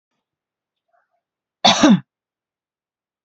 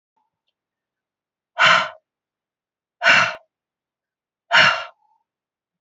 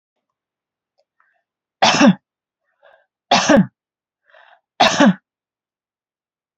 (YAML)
cough_length: 3.2 s
cough_amplitude: 30043
cough_signal_mean_std_ratio: 0.25
exhalation_length: 5.8 s
exhalation_amplitude: 28194
exhalation_signal_mean_std_ratio: 0.3
three_cough_length: 6.6 s
three_cough_amplitude: 32376
three_cough_signal_mean_std_ratio: 0.31
survey_phase: beta (2021-08-13 to 2022-03-07)
age: 45-64
gender: Female
wearing_mask: 'No'
symptom_headache: true
smoker_status: Never smoked
respiratory_condition_asthma: false
respiratory_condition_other: false
recruitment_source: REACT
submission_delay: 2 days
covid_test_result: Negative
covid_test_method: RT-qPCR